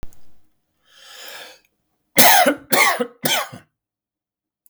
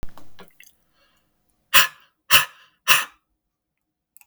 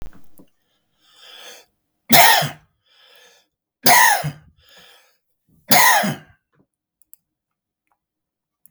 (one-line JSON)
{"cough_length": "4.7 s", "cough_amplitude": 32768, "cough_signal_mean_std_ratio": 0.37, "exhalation_length": "4.3 s", "exhalation_amplitude": 32768, "exhalation_signal_mean_std_ratio": 0.27, "three_cough_length": "8.7 s", "three_cough_amplitude": 32768, "three_cough_signal_mean_std_ratio": 0.31, "survey_phase": "beta (2021-08-13 to 2022-03-07)", "age": "45-64", "gender": "Male", "wearing_mask": "No", "symptom_none": true, "smoker_status": "Never smoked", "respiratory_condition_asthma": false, "respiratory_condition_other": false, "recruitment_source": "REACT", "submission_delay": "1 day", "covid_test_result": "Negative", "covid_test_method": "RT-qPCR", "influenza_a_test_result": "Negative", "influenza_b_test_result": "Negative"}